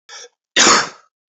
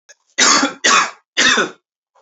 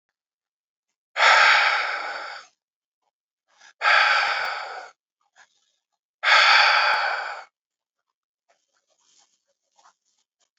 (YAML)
cough_length: 1.3 s
cough_amplitude: 32418
cough_signal_mean_std_ratio: 0.42
three_cough_length: 2.2 s
three_cough_amplitude: 32767
three_cough_signal_mean_std_ratio: 0.55
exhalation_length: 10.6 s
exhalation_amplitude: 25172
exhalation_signal_mean_std_ratio: 0.41
survey_phase: beta (2021-08-13 to 2022-03-07)
age: 18-44
gender: Male
wearing_mask: 'No'
symptom_runny_or_blocked_nose: true
symptom_fatigue: true
symptom_headache: true
symptom_change_to_sense_of_smell_or_taste: true
smoker_status: Never smoked
respiratory_condition_asthma: false
respiratory_condition_other: false
recruitment_source: Test and Trace
submission_delay: 3 days
covid_test_result: Positive
covid_test_method: ePCR